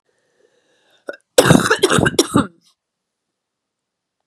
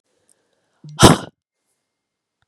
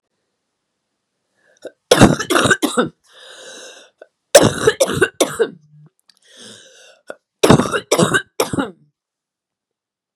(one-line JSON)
{"cough_length": "4.3 s", "cough_amplitude": 32768, "cough_signal_mean_std_ratio": 0.32, "exhalation_length": "2.5 s", "exhalation_amplitude": 32768, "exhalation_signal_mean_std_ratio": 0.21, "three_cough_length": "10.2 s", "three_cough_amplitude": 32768, "three_cough_signal_mean_std_ratio": 0.35, "survey_phase": "beta (2021-08-13 to 2022-03-07)", "age": "45-64", "gender": "Female", "wearing_mask": "No", "symptom_cough_any": true, "symptom_new_continuous_cough": true, "symptom_runny_or_blocked_nose": true, "symptom_change_to_sense_of_smell_or_taste": true, "symptom_loss_of_taste": true, "symptom_onset": "4 days", "smoker_status": "Never smoked", "respiratory_condition_asthma": false, "respiratory_condition_other": false, "recruitment_source": "Test and Trace", "submission_delay": "2 days", "covid_test_result": "Positive", "covid_test_method": "RT-qPCR", "covid_ct_value": 15.2, "covid_ct_gene": "ORF1ab gene", "covid_ct_mean": 15.5, "covid_viral_load": "8000000 copies/ml", "covid_viral_load_category": "High viral load (>1M copies/ml)"}